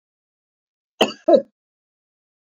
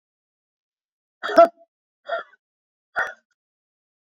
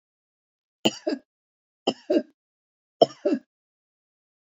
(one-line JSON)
{"cough_length": "2.5 s", "cough_amplitude": 27447, "cough_signal_mean_std_ratio": 0.22, "exhalation_length": "4.0 s", "exhalation_amplitude": 31599, "exhalation_signal_mean_std_ratio": 0.2, "three_cough_length": "4.4 s", "three_cough_amplitude": 26071, "three_cough_signal_mean_std_ratio": 0.23, "survey_phase": "beta (2021-08-13 to 2022-03-07)", "age": "65+", "gender": "Female", "wearing_mask": "No", "symptom_none": true, "smoker_status": "Never smoked", "respiratory_condition_asthma": false, "respiratory_condition_other": false, "recruitment_source": "REACT", "submission_delay": "2 days", "covid_test_result": "Negative", "covid_test_method": "RT-qPCR", "influenza_a_test_result": "Negative", "influenza_b_test_result": "Negative"}